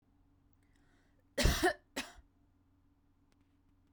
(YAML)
cough_length: 3.9 s
cough_amplitude: 5492
cough_signal_mean_std_ratio: 0.26
survey_phase: beta (2021-08-13 to 2022-03-07)
age: 18-44
gender: Female
wearing_mask: 'No'
symptom_none: true
smoker_status: Ex-smoker
respiratory_condition_asthma: false
respiratory_condition_other: false
recruitment_source: REACT
submission_delay: 1 day
covid_test_result: Negative
covid_test_method: RT-qPCR